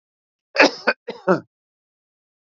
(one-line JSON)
{"cough_length": "2.5 s", "cough_amplitude": 32215, "cough_signal_mean_std_ratio": 0.27, "survey_phase": "beta (2021-08-13 to 2022-03-07)", "age": "45-64", "gender": "Male", "wearing_mask": "No", "symptom_none": true, "smoker_status": "Never smoked", "respiratory_condition_asthma": false, "respiratory_condition_other": false, "recruitment_source": "REACT", "submission_delay": "3 days", "covid_test_result": "Negative", "covid_test_method": "RT-qPCR"}